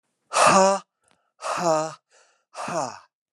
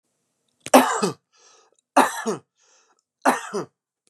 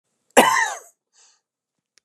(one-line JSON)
{"exhalation_length": "3.3 s", "exhalation_amplitude": 19482, "exhalation_signal_mean_std_ratio": 0.45, "three_cough_length": "4.1 s", "three_cough_amplitude": 32342, "three_cough_signal_mean_std_ratio": 0.32, "cough_length": "2.0 s", "cough_amplitude": 32768, "cough_signal_mean_std_ratio": 0.3, "survey_phase": "beta (2021-08-13 to 2022-03-07)", "age": "45-64", "gender": "Male", "wearing_mask": "No", "symptom_none": true, "smoker_status": "Never smoked", "respiratory_condition_asthma": false, "respiratory_condition_other": false, "recruitment_source": "Test and Trace", "submission_delay": "1 day", "covid_test_result": "Negative", "covid_test_method": "LFT"}